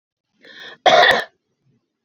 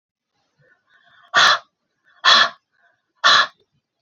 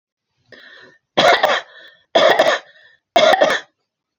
{
  "cough_length": "2.0 s",
  "cough_amplitude": 28885,
  "cough_signal_mean_std_ratio": 0.36,
  "exhalation_length": "4.0 s",
  "exhalation_amplitude": 29072,
  "exhalation_signal_mean_std_ratio": 0.34,
  "three_cough_length": "4.2 s",
  "three_cough_amplitude": 30012,
  "three_cough_signal_mean_std_ratio": 0.46,
  "survey_phase": "alpha (2021-03-01 to 2021-08-12)",
  "age": "45-64",
  "gender": "Female",
  "wearing_mask": "No",
  "symptom_none": true,
  "smoker_status": "Ex-smoker",
  "respiratory_condition_asthma": false,
  "respiratory_condition_other": false,
  "recruitment_source": "REACT",
  "submission_delay": "7 days",
  "covid_test_result": "Negative",
  "covid_test_method": "RT-qPCR"
}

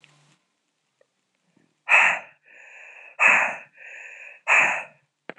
{
  "exhalation_length": "5.4 s",
  "exhalation_amplitude": 25001,
  "exhalation_signal_mean_std_ratio": 0.36,
  "survey_phase": "alpha (2021-03-01 to 2021-08-12)",
  "age": "18-44",
  "gender": "Female",
  "wearing_mask": "No",
  "symptom_none": true,
  "smoker_status": "Never smoked",
  "respiratory_condition_asthma": false,
  "respiratory_condition_other": false,
  "recruitment_source": "REACT",
  "submission_delay": "2 days",
  "covid_test_result": "Negative",
  "covid_test_method": "RT-qPCR"
}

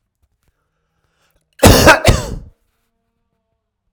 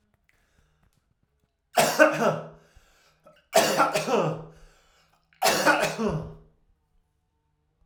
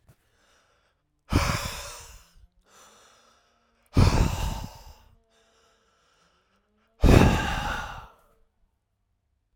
{
  "cough_length": "3.9 s",
  "cough_amplitude": 32768,
  "cough_signal_mean_std_ratio": 0.3,
  "three_cough_length": "7.9 s",
  "three_cough_amplitude": 24963,
  "three_cough_signal_mean_std_ratio": 0.41,
  "exhalation_length": "9.6 s",
  "exhalation_amplitude": 25662,
  "exhalation_signal_mean_std_ratio": 0.32,
  "survey_phase": "alpha (2021-03-01 to 2021-08-12)",
  "age": "45-64",
  "gender": "Male",
  "wearing_mask": "No",
  "symptom_diarrhoea": true,
  "smoker_status": "Never smoked",
  "respiratory_condition_asthma": false,
  "respiratory_condition_other": false,
  "recruitment_source": "REACT",
  "submission_delay": "2 days",
  "covid_test_result": "Negative",
  "covid_test_method": "RT-qPCR"
}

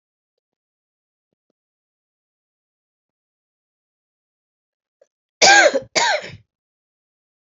{
  "cough_length": "7.6 s",
  "cough_amplitude": 32768,
  "cough_signal_mean_std_ratio": 0.21,
  "survey_phase": "alpha (2021-03-01 to 2021-08-12)",
  "age": "18-44",
  "gender": "Female",
  "wearing_mask": "No",
  "symptom_cough_any": true,
  "symptom_new_continuous_cough": true,
  "symptom_shortness_of_breath": true,
  "symptom_abdominal_pain": true,
  "symptom_fatigue": true,
  "symptom_fever_high_temperature": true,
  "symptom_headache": true,
  "symptom_change_to_sense_of_smell_or_taste": true,
  "symptom_loss_of_taste": true,
  "smoker_status": "Never smoked",
  "respiratory_condition_asthma": false,
  "respiratory_condition_other": false,
  "recruitment_source": "Test and Trace",
  "submission_delay": "1 day",
  "covid_test_result": "Positive",
  "covid_test_method": "RT-qPCR",
  "covid_ct_value": 21.6,
  "covid_ct_gene": "ORF1ab gene",
  "covid_ct_mean": 23.5,
  "covid_viral_load": "20000 copies/ml",
  "covid_viral_load_category": "Low viral load (10K-1M copies/ml)"
}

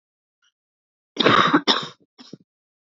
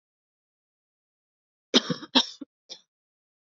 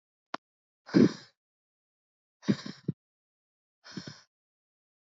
{
  "cough_length": "2.9 s",
  "cough_amplitude": 26794,
  "cough_signal_mean_std_ratio": 0.34,
  "three_cough_length": "3.4 s",
  "three_cough_amplitude": 19889,
  "three_cough_signal_mean_std_ratio": 0.2,
  "exhalation_length": "5.1 s",
  "exhalation_amplitude": 12968,
  "exhalation_signal_mean_std_ratio": 0.19,
  "survey_phase": "beta (2021-08-13 to 2022-03-07)",
  "age": "18-44",
  "gender": "Female",
  "wearing_mask": "No",
  "symptom_cough_any": true,
  "symptom_new_continuous_cough": true,
  "symptom_runny_or_blocked_nose": true,
  "symptom_sore_throat": true,
  "symptom_headache": true,
  "symptom_change_to_sense_of_smell_or_taste": true,
  "symptom_loss_of_taste": true,
  "symptom_onset": "3 days",
  "smoker_status": "Ex-smoker",
  "respiratory_condition_asthma": false,
  "respiratory_condition_other": false,
  "recruitment_source": "Test and Trace",
  "submission_delay": "2 days",
  "covid_test_result": "Positive",
  "covid_test_method": "RT-qPCR"
}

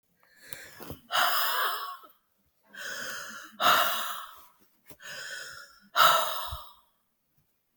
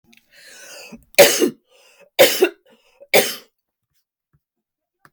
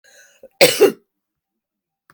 {
  "exhalation_length": "7.8 s",
  "exhalation_amplitude": 15195,
  "exhalation_signal_mean_std_ratio": 0.46,
  "three_cough_length": "5.1 s",
  "three_cough_amplitude": 32768,
  "three_cough_signal_mean_std_ratio": 0.3,
  "cough_length": "2.1 s",
  "cough_amplitude": 32768,
  "cough_signal_mean_std_ratio": 0.27,
  "survey_phase": "beta (2021-08-13 to 2022-03-07)",
  "age": "45-64",
  "gender": "Female",
  "wearing_mask": "No",
  "symptom_other": true,
  "smoker_status": "Ex-smoker",
  "respiratory_condition_asthma": false,
  "respiratory_condition_other": false,
  "recruitment_source": "REACT",
  "submission_delay": "6 days",
  "covid_test_result": "Negative",
  "covid_test_method": "RT-qPCR",
  "influenza_a_test_result": "Negative",
  "influenza_b_test_result": "Negative"
}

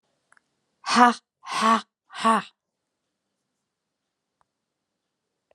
{
  "exhalation_length": "5.5 s",
  "exhalation_amplitude": 28475,
  "exhalation_signal_mean_std_ratio": 0.27,
  "survey_phase": "alpha (2021-03-01 to 2021-08-12)",
  "age": "45-64",
  "gender": "Female",
  "wearing_mask": "No",
  "symptom_cough_any": true,
  "symptom_new_continuous_cough": true,
  "symptom_shortness_of_breath": true,
  "symptom_fatigue": true,
  "symptom_headache": true,
  "symptom_change_to_sense_of_smell_or_taste": true,
  "smoker_status": "Never smoked",
  "respiratory_condition_asthma": true,
  "respiratory_condition_other": false,
  "recruitment_source": "Test and Trace",
  "submission_delay": "3 days",
  "covid_test_result": "Positive",
  "covid_test_method": "RT-qPCR",
  "covid_ct_value": 23.6,
  "covid_ct_gene": "ORF1ab gene",
  "covid_ct_mean": 23.7,
  "covid_viral_load": "17000 copies/ml",
  "covid_viral_load_category": "Low viral load (10K-1M copies/ml)"
}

